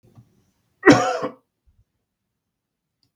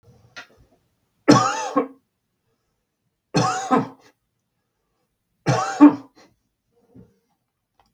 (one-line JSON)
{"cough_length": "3.2 s", "cough_amplitude": 32768, "cough_signal_mean_std_ratio": 0.23, "three_cough_length": "7.9 s", "three_cough_amplitude": 32768, "three_cough_signal_mean_std_ratio": 0.28, "survey_phase": "beta (2021-08-13 to 2022-03-07)", "age": "65+", "gender": "Male", "wearing_mask": "No", "symptom_none": true, "smoker_status": "Ex-smoker", "respiratory_condition_asthma": true, "respiratory_condition_other": false, "recruitment_source": "REACT", "submission_delay": "0 days", "covid_test_result": "Negative", "covid_test_method": "RT-qPCR"}